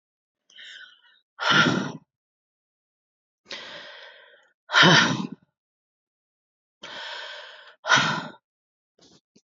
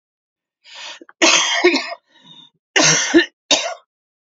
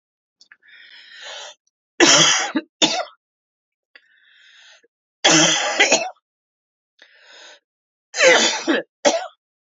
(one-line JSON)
{"exhalation_length": "9.5 s", "exhalation_amplitude": 23294, "exhalation_signal_mean_std_ratio": 0.32, "cough_length": "4.3 s", "cough_amplitude": 32768, "cough_signal_mean_std_ratio": 0.46, "three_cough_length": "9.7 s", "three_cough_amplitude": 32016, "three_cough_signal_mean_std_ratio": 0.39, "survey_phase": "beta (2021-08-13 to 2022-03-07)", "age": "65+", "gender": "Female", "wearing_mask": "No", "symptom_cough_any": true, "symptom_diarrhoea": true, "symptom_fatigue": true, "symptom_loss_of_taste": true, "symptom_onset": "4 days", "smoker_status": "Never smoked", "respiratory_condition_asthma": false, "respiratory_condition_other": false, "recruitment_source": "Test and Trace", "submission_delay": "2 days", "covid_test_result": "Positive", "covid_test_method": "RT-qPCR", "covid_ct_value": 20.1, "covid_ct_gene": "ORF1ab gene", "covid_ct_mean": 21.0, "covid_viral_load": "130000 copies/ml", "covid_viral_load_category": "Low viral load (10K-1M copies/ml)"}